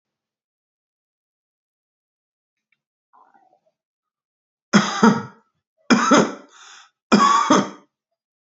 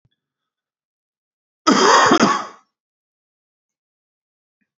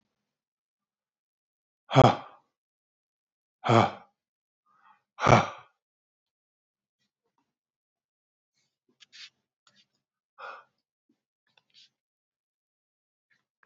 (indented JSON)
{
  "three_cough_length": "8.4 s",
  "three_cough_amplitude": 28540,
  "three_cough_signal_mean_std_ratio": 0.31,
  "cough_length": "4.8 s",
  "cough_amplitude": 31350,
  "cough_signal_mean_std_ratio": 0.32,
  "exhalation_length": "13.7 s",
  "exhalation_amplitude": 23521,
  "exhalation_signal_mean_std_ratio": 0.17,
  "survey_phase": "beta (2021-08-13 to 2022-03-07)",
  "age": "45-64",
  "gender": "Male",
  "wearing_mask": "No",
  "symptom_none": true,
  "smoker_status": "Ex-smoker",
  "respiratory_condition_asthma": false,
  "respiratory_condition_other": false,
  "recruitment_source": "REACT",
  "submission_delay": "2 days",
  "covid_test_result": "Negative",
  "covid_test_method": "RT-qPCR",
  "influenza_a_test_result": "Negative",
  "influenza_b_test_result": "Negative"
}